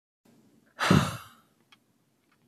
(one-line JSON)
{"exhalation_length": "2.5 s", "exhalation_amplitude": 12945, "exhalation_signal_mean_std_ratio": 0.28, "survey_phase": "alpha (2021-03-01 to 2021-08-12)", "age": "45-64", "gender": "Male", "wearing_mask": "No", "symptom_none": true, "smoker_status": "Ex-smoker", "respiratory_condition_asthma": false, "respiratory_condition_other": false, "recruitment_source": "REACT", "submission_delay": "1 day", "covid_test_result": "Negative", "covid_test_method": "RT-qPCR"}